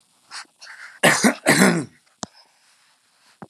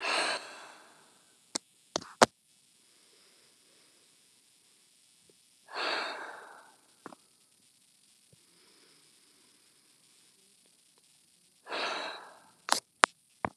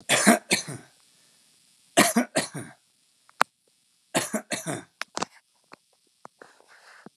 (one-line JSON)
{"cough_length": "3.5 s", "cough_amplitude": 32767, "cough_signal_mean_std_ratio": 0.36, "exhalation_length": "13.6 s", "exhalation_amplitude": 32767, "exhalation_signal_mean_std_ratio": 0.22, "three_cough_length": "7.2 s", "three_cough_amplitude": 32768, "three_cough_signal_mean_std_ratio": 0.3, "survey_phase": "beta (2021-08-13 to 2022-03-07)", "age": "45-64", "gender": "Male", "wearing_mask": "No", "symptom_none": true, "smoker_status": "Never smoked", "respiratory_condition_asthma": false, "respiratory_condition_other": false, "recruitment_source": "Test and Trace", "submission_delay": "0 days", "covid_test_result": "Negative", "covid_test_method": "LFT"}